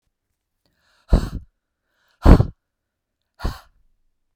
{"exhalation_length": "4.4 s", "exhalation_amplitude": 32768, "exhalation_signal_mean_std_ratio": 0.21, "survey_phase": "beta (2021-08-13 to 2022-03-07)", "age": "45-64", "gender": "Female", "wearing_mask": "No", "symptom_none": true, "smoker_status": "Ex-smoker", "respiratory_condition_asthma": false, "respiratory_condition_other": false, "recruitment_source": "REACT", "submission_delay": "2 days", "covid_test_result": "Negative", "covid_test_method": "RT-qPCR", "influenza_a_test_result": "Negative", "influenza_b_test_result": "Negative"}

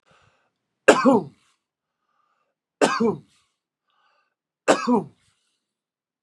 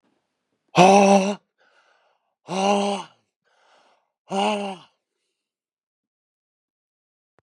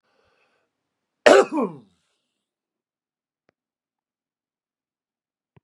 {"three_cough_length": "6.2 s", "three_cough_amplitude": 31858, "three_cough_signal_mean_std_ratio": 0.28, "exhalation_length": "7.4 s", "exhalation_amplitude": 31102, "exhalation_signal_mean_std_ratio": 0.31, "cough_length": "5.6 s", "cough_amplitude": 32767, "cough_signal_mean_std_ratio": 0.17, "survey_phase": "beta (2021-08-13 to 2022-03-07)", "age": "45-64", "gender": "Male", "wearing_mask": "No", "symptom_none": true, "smoker_status": "Current smoker (e-cigarettes or vapes only)", "respiratory_condition_asthma": false, "respiratory_condition_other": false, "recruitment_source": "REACT", "submission_delay": "1 day", "covid_test_result": "Negative", "covid_test_method": "RT-qPCR", "influenza_a_test_result": "Negative", "influenza_b_test_result": "Negative"}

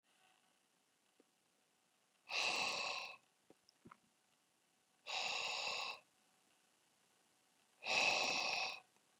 {"exhalation_length": "9.2 s", "exhalation_amplitude": 2006, "exhalation_signal_mean_std_ratio": 0.43, "survey_phase": "beta (2021-08-13 to 2022-03-07)", "age": "45-64", "gender": "Male", "wearing_mask": "No", "symptom_change_to_sense_of_smell_or_taste": true, "smoker_status": "Ex-smoker", "respiratory_condition_asthma": false, "respiratory_condition_other": false, "recruitment_source": "REACT", "submission_delay": "2 days", "covid_test_result": "Negative", "covid_test_method": "RT-qPCR"}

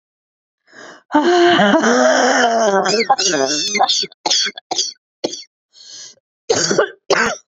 {"exhalation_length": "7.6 s", "exhalation_amplitude": 32767, "exhalation_signal_mean_std_ratio": 0.66, "survey_phase": "beta (2021-08-13 to 2022-03-07)", "age": "45-64", "gender": "Female", "wearing_mask": "No", "symptom_cough_any": true, "symptom_runny_or_blocked_nose": true, "symptom_sore_throat": true, "symptom_fatigue": true, "symptom_fever_high_temperature": true, "symptom_headache": true, "symptom_loss_of_taste": true, "symptom_other": true, "symptom_onset": "5 days", "smoker_status": "Never smoked", "respiratory_condition_asthma": false, "respiratory_condition_other": true, "recruitment_source": "Test and Trace", "submission_delay": "2 days", "covid_test_result": "Positive", "covid_test_method": "RT-qPCR", "covid_ct_value": 18.8, "covid_ct_gene": "ORF1ab gene", "covid_ct_mean": 19.3, "covid_viral_load": "470000 copies/ml", "covid_viral_load_category": "Low viral load (10K-1M copies/ml)"}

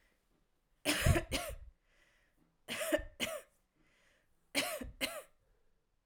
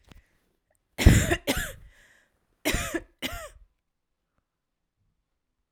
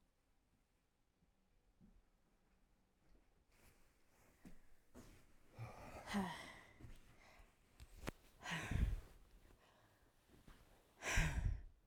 {"three_cough_length": "6.1 s", "three_cough_amplitude": 5881, "three_cough_signal_mean_std_ratio": 0.38, "cough_length": "5.7 s", "cough_amplitude": 30039, "cough_signal_mean_std_ratio": 0.27, "exhalation_length": "11.9 s", "exhalation_amplitude": 1811, "exhalation_signal_mean_std_ratio": 0.36, "survey_phase": "alpha (2021-03-01 to 2021-08-12)", "age": "18-44", "gender": "Female", "wearing_mask": "Yes", "symptom_shortness_of_breath": true, "symptom_fatigue": true, "symptom_fever_high_temperature": true, "symptom_headache": true, "symptom_change_to_sense_of_smell_or_taste": true, "symptom_onset": "3 days", "smoker_status": "Never smoked", "respiratory_condition_asthma": false, "respiratory_condition_other": false, "recruitment_source": "Test and Trace", "submission_delay": "1 day", "covid_test_result": "Positive", "covid_test_method": "RT-qPCR", "covid_ct_value": 22.7, "covid_ct_gene": "ORF1ab gene", "covid_ct_mean": 24.1, "covid_viral_load": "12000 copies/ml", "covid_viral_load_category": "Low viral load (10K-1M copies/ml)"}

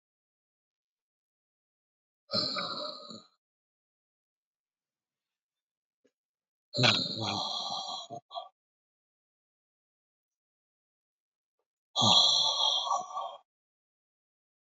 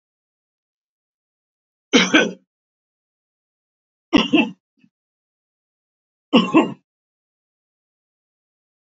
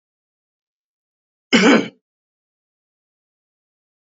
{"exhalation_length": "14.7 s", "exhalation_amplitude": 10328, "exhalation_signal_mean_std_ratio": 0.33, "three_cough_length": "8.9 s", "three_cough_amplitude": 28575, "three_cough_signal_mean_std_ratio": 0.24, "cough_length": "4.2 s", "cough_amplitude": 27679, "cough_signal_mean_std_ratio": 0.22, "survey_phase": "alpha (2021-03-01 to 2021-08-12)", "age": "65+", "gender": "Male", "wearing_mask": "No", "symptom_none": true, "smoker_status": "Ex-smoker", "respiratory_condition_asthma": false, "respiratory_condition_other": false, "recruitment_source": "REACT", "submission_delay": "1 day", "covid_test_result": "Negative", "covid_test_method": "RT-qPCR"}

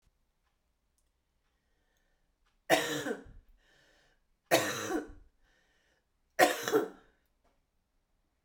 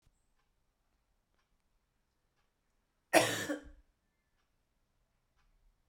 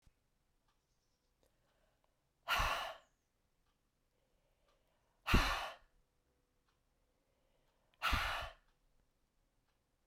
{"three_cough_length": "8.4 s", "three_cough_amplitude": 11487, "three_cough_signal_mean_std_ratio": 0.29, "cough_length": "5.9 s", "cough_amplitude": 11065, "cough_signal_mean_std_ratio": 0.18, "exhalation_length": "10.1 s", "exhalation_amplitude": 3873, "exhalation_signal_mean_std_ratio": 0.27, "survey_phase": "beta (2021-08-13 to 2022-03-07)", "age": "18-44", "gender": "Female", "wearing_mask": "No", "symptom_cough_any": true, "symptom_runny_or_blocked_nose": true, "symptom_shortness_of_breath": true, "symptom_sore_throat": true, "symptom_diarrhoea": true, "symptom_fatigue": true, "symptom_loss_of_taste": true, "symptom_onset": "2 days", "smoker_status": "Never smoked", "respiratory_condition_asthma": false, "respiratory_condition_other": false, "recruitment_source": "Test and Trace", "submission_delay": "1 day", "covid_test_result": "Positive", "covid_test_method": "RT-qPCR"}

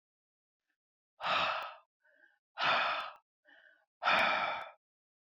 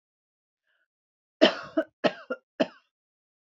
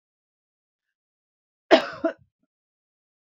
{"exhalation_length": "5.2 s", "exhalation_amplitude": 5052, "exhalation_signal_mean_std_ratio": 0.46, "three_cough_length": "3.5 s", "three_cough_amplitude": 21637, "three_cough_signal_mean_std_ratio": 0.23, "cough_length": "3.3 s", "cough_amplitude": 26491, "cough_signal_mean_std_ratio": 0.17, "survey_phase": "beta (2021-08-13 to 2022-03-07)", "age": "65+", "gender": "Female", "wearing_mask": "No", "symptom_none": true, "smoker_status": "Never smoked", "respiratory_condition_asthma": false, "respiratory_condition_other": false, "recruitment_source": "REACT", "submission_delay": "0 days", "covid_test_result": "Negative", "covid_test_method": "RT-qPCR"}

